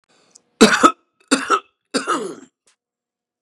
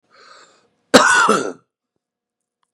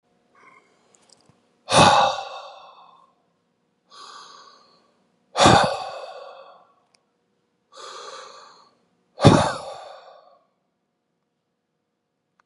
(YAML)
three_cough_length: 3.4 s
three_cough_amplitude: 32768
three_cough_signal_mean_std_ratio: 0.33
cough_length: 2.7 s
cough_amplitude: 32768
cough_signal_mean_std_ratio: 0.35
exhalation_length: 12.5 s
exhalation_amplitude: 32768
exhalation_signal_mean_std_ratio: 0.27
survey_phase: beta (2021-08-13 to 2022-03-07)
age: 45-64
gender: Male
wearing_mask: 'No'
symptom_shortness_of_breath: true
symptom_onset: 12 days
smoker_status: Ex-smoker
respiratory_condition_asthma: false
respiratory_condition_other: false
recruitment_source: REACT
submission_delay: 3 days
covid_test_result: Negative
covid_test_method: RT-qPCR
influenza_a_test_result: Negative
influenza_b_test_result: Negative